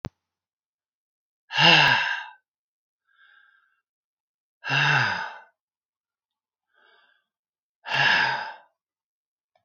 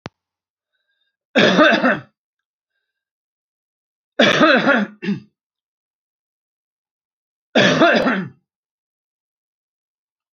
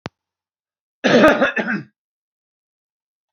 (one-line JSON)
{"exhalation_length": "9.6 s", "exhalation_amplitude": 24418, "exhalation_signal_mean_std_ratio": 0.34, "three_cough_length": "10.3 s", "three_cough_amplitude": 28737, "three_cough_signal_mean_std_ratio": 0.36, "cough_length": "3.3 s", "cough_amplitude": 28503, "cough_signal_mean_std_ratio": 0.34, "survey_phase": "alpha (2021-03-01 to 2021-08-12)", "age": "65+", "gender": "Male", "wearing_mask": "No", "symptom_none": true, "smoker_status": "Never smoked", "respiratory_condition_asthma": false, "respiratory_condition_other": false, "recruitment_source": "REACT", "submission_delay": "2 days", "covid_test_result": "Negative", "covid_test_method": "RT-qPCR"}